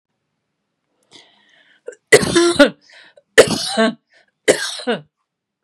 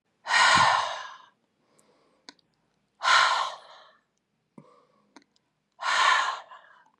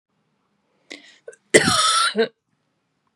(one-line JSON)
{"three_cough_length": "5.6 s", "three_cough_amplitude": 32768, "three_cough_signal_mean_std_ratio": 0.34, "exhalation_length": "7.0 s", "exhalation_amplitude": 15001, "exhalation_signal_mean_std_ratio": 0.41, "cough_length": "3.2 s", "cough_amplitude": 32768, "cough_signal_mean_std_ratio": 0.37, "survey_phase": "beta (2021-08-13 to 2022-03-07)", "age": "45-64", "gender": "Female", "wearing_mask": "No", "symptom_cough_any": true, "symptom_onset": "4 days", "smoker_status": "Ex-smoker", "respiratory_condition_asthma": true, "respiratory_condition_other": false, "recruitment_source": "Test and Trace", "submission_delay": "1 day", "covid_test_result": "Negative", "covid_test_method": "ePCR"}